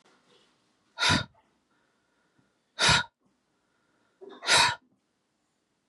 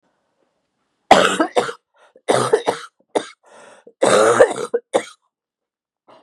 {"exhalation_length": "5.9 s", "exhalation_amplitude": 15200, "exhalation_signal_mean_std_ratio": 0.29, "cough_length": "6.2 s", "cough_amplitude": 32768, "cough_signal_mean_std_ratio": 0.38, "survey_phase": "beta (2021-08-13 to 2022-03-07)", "age": "45-64", "gender": "Female", "wearing_mask": "No", "symptom_cough_any": true, "symptom_runny_or_blocked_nose": true, "symptom_sore_throat": true, "symptom_headache": true, "symptom_onset": "3 days", "smoker_status": "Never smoked", "respiratory_condition_asthma": false, "respiratory_condition_other": false, "recruitment_source": "Test and Trace", "submission_delay": "1 day", "covid_test_result": "Negative", "covid_test_method": "RT-qPCR"}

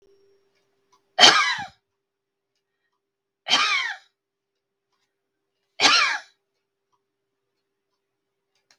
{"three_cough_length": "8.8 s", "three_cough_amplitude": 32768, "three_cough_signal_mean_std_ratio": 0.27, "survey_phase": "beta (2021-08-13 to 2022-03-07)", "age": "45-64", "gender": "Female", "wearing_mask": "No", "symptom_none": true, "smoker_status": "Never smoked", "respiratory_condition_asthma": false, "respiratory_condition_other": false, "recruitment_source": "REACT", "submission_delay": "1 day", "covid_test_result": "Negative", "covid_test_method": "RT-qPCR"}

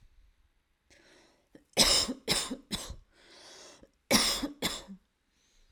{"cough_length": "5.7 s", "cough_amplitude": 13434, "cough_signal_mean_std_ratio": 0.37, "survey_phase": "alpha (2021-03-01 to 2021-08-12)", "age": "18-44", "gender": "Female", "wearing_mask": "No", "symptom_none": true, "smoker_status": "Current smoker (e-cigarettes or vapes only)", "respiratory_condition_asthma": false, "respiratory_condition_other": false, "recruitment_source": "REACT", "submission_delay": "0 days", "covid_test_result": "Negative", "covid_test_method": "RT-qPCR"}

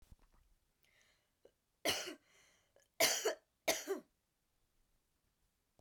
{"three_cough_length": "5.8 s", "three_cough_amplitude": 4833, "three_cough_signal_mean_std_ratio": 0.29, "survey_phase": "beta (2021-08-13 to 2022-03-07)", "age": "45-64", "gender": "Female", "wearing_mask": "No", "symptom_cough_any": true, "symptom_runny_or_blocked_nose": true, "symptom_sore_throat": true, "symptom_diarrhoea": true, "symptom_fatigue": true, "symptom_headache": true, "symptom_other": true, "smoker_status": "Current smoker (e-cigarettes or vapes only)", "respiratory_condition_asthma": false, "respiratory_condition_other": false, "recruitment_source": "Test and Trace", "submission_delay": "1 day", "covid_test_result": "Positive", "covid_test_method": "LFT"}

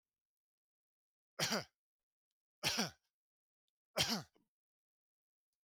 {"three_cough_length": "5.6 s", "three_cough_amplitude": 3241, "three_cough_signal_mean_std_ratio": 0.27, "survey_phase": "beta (2021-08-13 to 2022-03-07)", "age": "45-64", "gender": "Male", "wearing_mask": "No", "symptom_none": true, "smoker_status": "Never smoked", "respiratory_condition_asthma": false, "respiratory_condition_other": false, "recruitment_source": "REACT", "submission_delay": "2 days", "covid_test_result": "Negative", "covid_test_method": "RT-qPCR", "influenza_a_test_result": "Negative", "influenza_b_test_result": "Negative"}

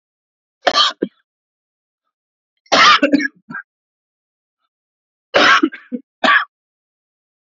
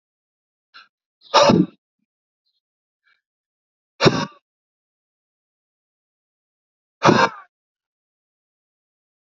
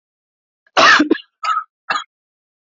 {"three_cough_length": "7.5 s", "three_cough_amplitude": 29778, "three_cough_signal_mean_std_ratio": 0.34, "exhalation_length": "9.3 s", "exhalation_amplitude": 30926, "exhalation_signal_mean_std_ratio": 0.22, "cough_length": "2.6 s", "cough_amplitude": 29645, "cough_signal_mean_std_ratio": 0.38, "survey_phase": "alpha (2021-03-01 to 2021-08-12)", "age": "45-64", "gender": "Male", "wearing_mask": "No", "symptom_none": true, "smoker_status": "Ex-smoker", "respiratory_condition_asthma": false, "respiratory_condition_other": false, "recruitment_source": "REACT", "submission_delay": "1 day", "covid_test_result": "Negative", "covid_test_method": "RT-qPCR"}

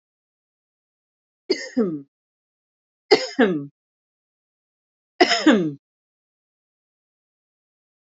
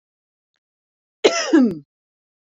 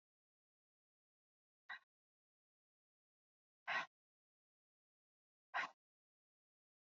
{"three_cough_length": "8.0 s", "three_cough_amplitude": 28981, "three_cough_signal_mean_std_ratio": 0.28, "cough_length": "2.5 s", "cough_amplitude": 29907, "cough_signal_mean_std_ratio": 0.33, "exhalation_length": "6.8 s", "exhalation_amplitude": 973, "exhalation_signal_mean_std_ratio": 0.18, "survey_phase": "beta (2021-08-13 to 2022-03-07)", "age": "45-64", "gender": "Female", "wearing_mask": "No", "symptom_none": true, "smoker_status": "Never smoked", "respiratory_condition_asthma": false, "respiratory_condition_other": false, "recruitment_source": "REACT", "submission_delay": "2 days", "covid_test_result": "Negative", "covid_test_method": "RT-qPCR"}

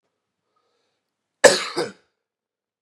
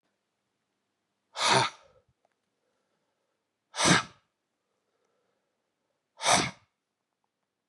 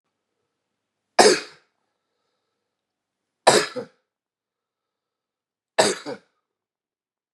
{"cough_length": "2.8 s", "cough_amplitude": 32768, "cough_signal_mean_std_ratio": 0.2, "exhalation_length": "7.7 s", "exhalation_amplitude": 13330, "exhalation_signal_mean_std_ratio": 0.26, "three_cough_length": "7.3 s", "three_cough_amplitude": 32768, "three_cough_signal_mean_std_ratio": 0.22, "survey_phase": "beta (2021-08-13 to 2022-03-07)", "age": "45-64", "gender": "Male", "wearing_mask": "No", "symptom_new_continuous_cough": true, "symptom_runny_or_blocked_nose": true, "symptom_shortness_of_breath": true, "symptom_sore_throat": true, "symptom_onset": "4 days", "smoker_status": "Ex-smoker", "respiratory_condition_asthma": false, "respiratory_condition_other": false, "recruitment_source": "Test and Trace", "submission_delay": "2 days", "covid_test_result": "Positive", "covid_test_method": "RT-qPCR", "covid_ct_value": 19.0, "covid_ct_gene": "ORF1ab gene"}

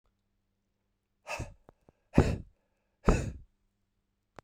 {"exhalation_length": "4.4 s", "exhalation_amplitude": 18081, "exhalation_signal_mean_std_ratio": 0.24, "survey_phase": "beta (2021-08-13 to 2022-03-07)", "age": "45-64", "gender": "Male", "wearing_mask": "No", "symptom_cough_any": true, "symptom_runny_or_blocked_nose": true, "symptom_fatigue": true, "symptom_headache": true, "symptom_onset": "3 days", "smoker_status": "Never smoked", "respiratory_condition_asthma": false, "respiratory_condition_other": false, "recruitment_source": "Test and Trace", "submission_delay": "1 day", "covid_test_result": "Positive", "covid_test_method": "RT-qPCR", "covid_ct_value": 15.6, "covid_ct_gene": "ORF1ab gene", "covid_ct_mean": 15.7, "covid_viral_load": "6800000 copies/ml", "covid_viral_load_category": "High viral load (>1M copies/ml)"}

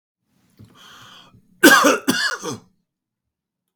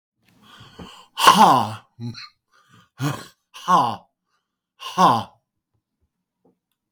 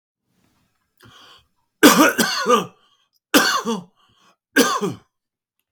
{"cough_length": "3.8 s", "cough_amplitude": 32768, "cough_signal_mean_std_ratio": 0.32, "exhalation_length": "6.9 s", "exhalation_amplitude": 32768, "exhalation_signal_mean_std_ratio": 0.33, "three_cough_length": "5.7 s", "three_cough_amplitude": 32768, "three_cough_signal_mean_std_ratio": 0.38, "survey_phase": "beta (2021-08-13 to 2022-03-07)", "age": "65+", "gender": "Male", "wearing_mask": "No", "symptom_none": true, "smoker_status": "Ex-smoker", "respiratory_condition_asthma": false, "respiratory_condition_other": true, "recruitment_source": "REACT", "submission_delay": "3 days", "covid_test_result": "Negative", "covid_test_method": "RT-qPCR", "influenza_a_test_result": "Negative", "influenza_b_test_result": "Negative"}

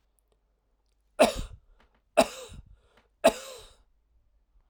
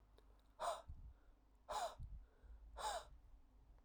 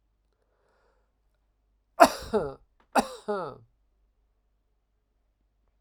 {"three_cough_length": "4.7 s", "three_cough_amplitude": 15728, "three_cough_signal_mean_std_ratio": 0.23, "exhalation_length": "3.8 s", "exhalation_amplitude": 912, "exhalation_signal_mean_std_ratio": 0.58, "cough_length": "5.8 s", "cough_amplitude": 30591, "cough_signal_mean_std_ratio": 0.2, "survey_phase": "alpha (2021-03-01 to 2021-08-12)", "age": "45-64", "gender": "Male", "wearing_mask": "No", "symptom_cough_any": true, "symptom_fatigue": true, "symptom_headache": true, "symptom_change_to_sense_of_smell_or_taste": true, "smoker_status": "Never smoked", "respiratory_condition_asthma": false, "respiratory_condition_other": false, "recruitment_source": "Test and Trace", "submission_delay": "3 days", "covid_test_result": "Positive", "covid_test_method": "LFT"}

